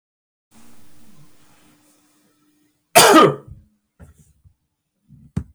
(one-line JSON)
{"cough_length": "5.5 s", "cough_amplitude": 32768, "cough_signal_mean_std_ratio": 0.25, "survey_phase": "beta (2021-08-13 to 2022-03-07)", "age": "45-64", "gender": "Male", "wearing_mask": "No", "symptom_none": true, "smoker_status": "Ex-smoker", "respiratory_condition_asthma": false, "respiratory_condition_other": false, "recruitment_source": "REACT", "submission_delay": "1 day", "covid_test_result": "Negative", "covid_test_method": "RT-qPCR", "influenza_a_test_result": "Negative", "influenza_b_test_result": "Negative"}